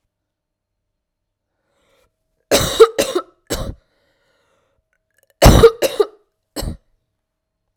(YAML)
cough_length: 7.8 s
cough_amplitude: 32768
cough_signal_mean_std_ratio: 0.27
survey_phase: alpha (2021-03-01 to 2021-08-12)
age: 18-44
gender: Female
wearing_mask: 'No'
symptom_cough_any: true
symptom_new_continuous_cough: true
symptom_shortness_of_breath: true
symptom_fatigue: true
symptom_headache: true
smoker_status: Current smoker (1 to 10 cigarettes per day)
respiratory_condition_asthma: false
respiratory_condition_other: false
recruitment_source: Test and Trace
submission_delay: 1 day
covid_test_result: Positive
covid_test_method: RT-qPCR
covid_ct_value: 20.5
covid_ct_gene: ORF1ab gene
covid_ct_mean: 21.8
covid_viral_load: 73000 copies/ml
covid_viral_load_category: Low viral load (10K-1M copies/ml)